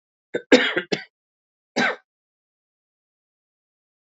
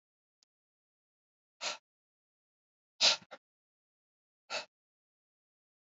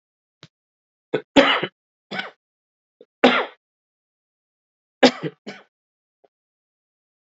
{"cough_length": "4.0 s", "cough_amplitude": 27901, "cough_signal_mean_std_ratio": 0.25, "exhalation_length": "6.0 s", "exhalation_amplitude": 7643, "exhalation_signal_mean_std_ratio": 0.17, "three_cough_length": "7.3 s", "three_cough_amplitude": 28028, "three_cough_signal_mean_std_ratio": 0.23, "survey_phase": "alpha (2021-03-01 to 2021-08-12)", "age": "45-64", "gender": "Male", "wearing_mask": "No", "symptom_cough_any": true, "symptom_fever_high_temperature": true, "symptom_onset": "3 days", "smoker_status": "Never smoked", "respiratory_condition_asthma": false, "respiratory_condition_other": false, "recruitment_source": "Test and Trace", "submission_delay": "1 day", "covid_test_result": "Positive", "covid_test_method": "RT-qPCR", "covid_ct_value": 33.3, "covid_ct_gene": "N gene"}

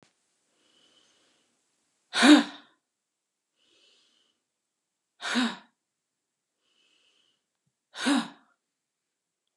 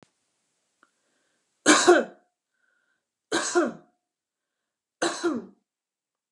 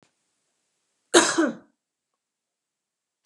{"exhalation_length": "9.6 s", "exhalation_amplitude": 18593, "exhalation_signal_mean_std_ratio": 0.2, "three_cough_length": "6.3 s", "three_cough_amplitude": 21300, "three_cough_signal_mean_std_ratio": 0.29, "cough_length": "3.3 s", "cough_amplitude": 29589, "cough_signal_mean_std_ratio": 0.24, "survey_phase": "beta (2021-08-13 to 2022-03-07)", "age": "45-64", "gender": "Female", "wearing_mask": "No", "symptom_none": true, "smoker_status": "Never smoked", "respiratory_condition_asthma": false, "respiratory_condition_other": false, "recruitment_source": "REACT", "submission_delay": "2 days", "covid_test_result": "Negative", "covid_test_method": "RT-qPCR", "influenza_a_test_result": "Negative", "influenza_b_test_result": "Negative"}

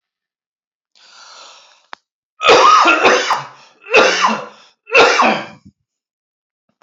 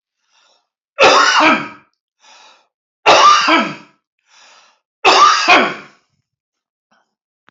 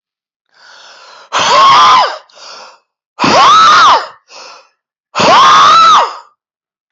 {"cough_length": "6.8 s", "cough_amplitude": 32540, "cough_signal_mean_std_ratio": 0.45, "three_cough_length": "7.5 s", "three_cough_amplitude": 31533, "three_cough_signal_mean_std_ratio": 0.44, "exhalation_length": "6.9 s", "exhalation_amplitude": 31126, "exhalation_signal_mean_std_ratio": 0.66, "survey_phase": "beta (2021-08-13 to 2022-03-07)", "age": "45-64", "gender": "Male", "wearing_mask": "No", "symptom_none": true, "smoker_status": "Never smoked", "respiratory_condition_asthma": false, "respiratory_condition_other": false, "recruitment_source": "REACT", "submission_delay": "1 day", "covid_test_result": "Negative", "covid_test_method": "RT-qPCR", "influenza_a_test_result": "Negative", "influenza_b_test_result": "Negative"}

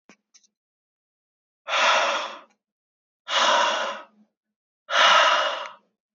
{"exhalation_length": "6.1 s", "exhalation_amplitude": 20064, "exhalation_signal_mean_std_ratio": 0.47, "survey_phase": "beta (2021-08-13 to 2022-03-07)", "age": "18-44", "gender": "Male", "wearing_mask": "No", "symptom_cough_any": true, "symptom_runny_or_blocked_nose": true, "symptom_sore_throat": true, "symptom_fatigue": true, "symptom_fever_high_temperature": true, "symptom_headache": true, "symptom_onset": "3 days", "smoker_status": "Never smoked", "respiratory_condition_asthma": false, "respiratory_condition_other": false, "recruitment_source": "Test and Trace", "submission_delay": "2 days", "covid_test_result": "Positive", "covid_test_method": "RT-qPCR"}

